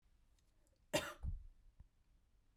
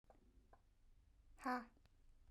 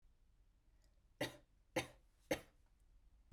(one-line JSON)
{"cough_length": "2.6 s", "cough_amplitude": 2726, "cough_signal_mean_std_ratio": 0.35, "exhalation_length": "2.3 s", "exhalation_amplitude": 819, "exhalation_signal_mean_std_ratio": 0.36, "three_cough_length": "3.3 s", "three_cough_amplitude": 1700, "three_cough_signal_mean_std_ratio": 0.28, "survey_phase": "beta (2021-08-13 to 2022-03-07)", "age": "18-44", "gender": "Female", "wearing_mask": "No", "symptom_none": true, "smoker_status": "Never smoked", "respiratory_condition_asthma": false, "respiratory_condition_other": false, "recruitment_source": "REACT", "submission_delay": "0 days", "covid_test_result": "Negative", "covid_test_method": "RT-qPCR", "influenza_a_test_result": "Negative", "influenza_b_test_result": "Negative"}